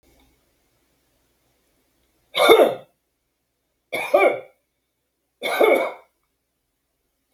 {"three_cough_length": "7.3 s", "three_cough_amplitude": 32767, "three_cough_signal_mean_std_ratio": 0.3, "survey_phase": "beta (2021-08-13 to 2022-03-07)", "age": "45-64", "gender": "Male", "wearing_mask": "No", "symptom_none": true, "smoker_status": "Never smoked", "respiratory_condition_asthma": false, "respiratory_condition_other": false, "recruitment_source": "REACT", "submission_delay": "1 day", "covid_test_result": "Negative", "covid_test_method": "RT-qPCR"}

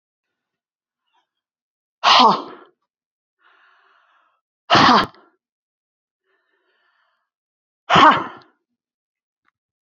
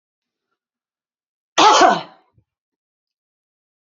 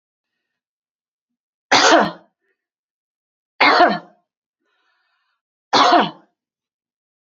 {"exhalation_length": "9.8 s", "exhalation_amplitude": 31340, "exhalation_signal_mean_std_ratio": 0.26, "cough_length": "3.8 s", "cough_amplitude": 32460, "cough_signal_mean_std_ratio": 0.26, "three_cough_length": "7.3 s", "three_cough_amplitude": 30393, "three_cough_signal_mean_std_ratio": 0.31, "survey_phase": "beta (2021-08-13 to 2022-03-07)", "age": "45-64", "gender": "Female", "wearing_mask": "No", "symptom_none": true, "smoker_status": "Never smoked", "respiratory_condition_asthma": true, "respiratory_condition_other": false, "recruitment_source": "Test and Trace", "submission_delay": "2 days", "covid_test_result": "Negative", "covid_test_method": "ePCR"}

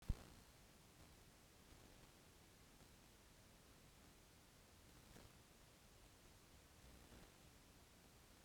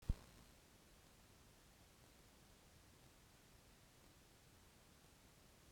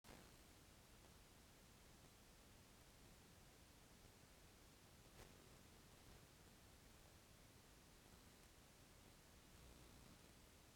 {"exhalation_length": "8.4 s", "exhalation_amplitude": 1286, "exhalation_signal_mean_std_ratio": 0.48, "three_cough_length": "5.7 s", "three_cough_amplitude": 1806, "three_cough_signal_mean_std_ratio": 0.31, "cough_length": "10.8 s", "cough_amplitude": 143, "cough_signal_mean_std_ratio": 1.2, "survey_phase": "beta (2021-08-13 to 2022-03-07)", "age": "45-64", "gender": "Female", "wearing_mask": "No", "symptom_cough_any": true, "symptom_runny_or_blocked_nose": true, "symptom_sore_throat": true, "symptom_diarrhoea": true, "symptom_fatigue": true, "symptom_fever_high_temperature": true, "symptom_onset": "3 days", "smoker_status": "Current smoker (e-cigarettes or vapes only)", "respiratory_condition_asthma": false, "respiratory_condition_other": false, "recruitment_source": "Test and Trace", "submission_delay": "1 day", "covid_test_result": "Positive", "covid_test_method": "RT-qPCR", "covid_ct_value": 24.9, "covid_ct_gene": "ORF1ab gene", "covid_ct_mean": 25.4, "covid_viral_load": "4500 copies/ml", "covid_viral_load_category": "Minimal viral load (< 10K copies/ml)"}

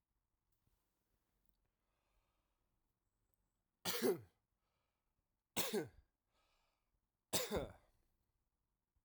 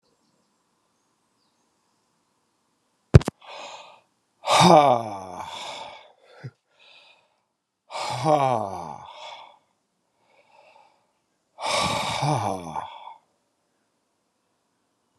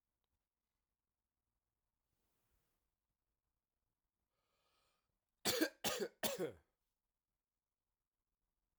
{"three_cough_length": "9.0 s", "three_cough_amplitude": 2479, "three_cough_signal_mean_std_ratio": 0.25, "exhalation_length": "15.2 s", "exhalation_amplitude": 32768, "exhalation_signal_mean_std_ratio": 0.29, "cough_length": "8.8 s", "cough_amplitude": 2411, "cough_signal_mean_std_ratio": 0.22, "survey_phase": "alpha (2021-03-01 to 2021-08-12)", "age": "18-44", "gender": "Male", "wearing_mask": "No", "symptom_change_to_sense_of_smell_or_taste": true, "smoker_status": "Ex-smoker", "respiratory_condition_asthma": false, "respiratory_condition_other": false, "recruitment_source": "Test and Trace", "submission_delay": "1 day", "covid_test_result": "Positive", "covid_test_method": "RT-qPCR", "covid_ct_value": 15.0, "covid_ct_gene": "ORF1ab gene"}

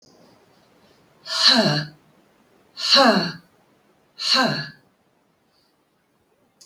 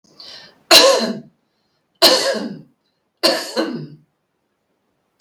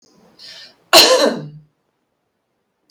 {"exhalation_length": "6.7 s", "exhalation_amplitude": 29219, "exhalation_signal_mean_std_ratio": 0.37, "three_cough_length": "5.2 s", "three_cough_amplitude": 32768, "three_cough_signal_mean_std_ratio": 0.38, "cough_length": "2.9 s", "cough_amplitude": 32768, "cough_signal_mean_std_ratio": 0.32, "survey_phase": "beta (2021-08-13 to 2022-03-07)", "age": "45-64", "gender": "Female", "wearing_mask": "No", "symptom_runny_or_blocked_nose": true, "smoker_status": "Never smoked", "respiratory_condition_asthma": false, "respiratory_condition_other": false, "recruitment_source": "REACT", "submission_delay": "1 day", "covid_test_result": "Negative", "covid_test_method": "RT-qPCR", "influenza_a_test_result": "Unknown/Void", "influenza_b_test_result": "Unknown/Void"}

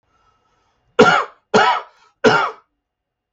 {"three_cough_length": "3.3 s", "three_cough_amplitude": 32768, "three_cough_signal_mean_std_ratio": 0.39, "survey_phase": "beta (2021-08-13 to 2022-03-07)", "age": "65+", "gender": "Male", "wearing_mask": "No", "symptom_none": true, "smoker_status": "Never smoked", "respiratory_condition_asthma": false, "respiratory_condition_other": false, "recruitment_source": "REACT", "submission_delay": "0 days", "covid_test_result": "Negative", "covid_test_method": "RT-qPCR", "influenza_a_test_result": "Negative", "influenza_b_test_result": "Negative"}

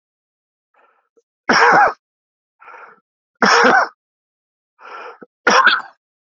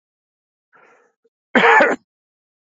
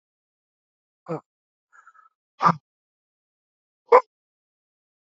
{"three_cough_length": "6.4 s", "three_cough_amplitude": 29244, "three_cough_signal_mean_std_ratio": 0.37, "cough_length": "2.7 s", "cough_amplitude": 32767, "cough_signal_mean_std_ratio": 0.31, "exhalation_length": "5.1 s", "exhalation_amplitude": 26825, "exhalation_signal_mean_std_ratio": 0.16, "survey_phase": "beta (2021-08-13 to 2022-03-07)", "age": "45-64", "gender": "Male", "wearing_mask": "No", "symptom_cough_any": true, "symptom_new_continuous_cough": true, "symptom_runny_or_blocked_nose": true, "symptom_shortness_of_breath": true, "symptom_sore_throat": true, "symptom_abdominal_pain": true, "symptom_fatigue": true, "symptom_headache": true, "smoker_status": "Never smoked", "respiratory_condition_asthma": true, "respiratory_condition_other": true, "recruitment_source": "Test and Trace", "submission_delay": "3 days", "covid_test_result": "Positive", "covid_test_method": "RT-qPCR", "covid_ct_value": 25.3, "covid_ct_gene": "N gene"}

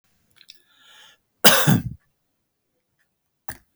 {"cough_length": "3.8 s", "cough_amplitude": 32768, "cough_signal_mean_std_ratio": 0.25, "survey_phase": "beta (2021-08-13 to 2022-03-07)", "age": "65+", "gender": "Male", "wearing_mask": "No", "symptom_none": true, "smoker_status": "Never smoked", "respiratory_condition_asthma": false, "respiratory_condition_other": true, "recruitment_source": "REACT", "submission_delay": "2 days", "covid_test_result": "Negative", "covid_test_method": "RT-qPCR"}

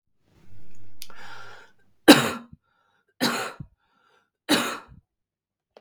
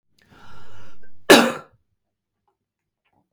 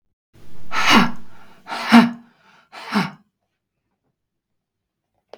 {"three_cough_length": "5.8 s", "three_cough_amplitude": 32768, "three_cough_signal_mean_std_ratio": 0.34, "cough_length": "3.3 s", "cough_amplitude": 32768, "cough_signal_mean_std_ratio": 0.34, "exhalation_length": "5.4 s", "exhalation_amplitude": 32768, "exhalation_signal_mean_std_ratio": 0.39, "survey_phase": "beta (2021-08-13 to 2022-03-07)", "age": "18-44", "gender": "Female", "wearing_mask": "No", "symptom_cough_any": true, "smoker_status": "Never smoked", "respiratory_condition_asthma": false, "respiratory_condition_other": false, "recruitment_source": "REACT", "submission_delay": "2 days", "covid_test_result": "Negative", "covid_test_method": "RT-qPCR", "influenza_a_test_result": "Negative", "influenza_b_test_result": "Negative"}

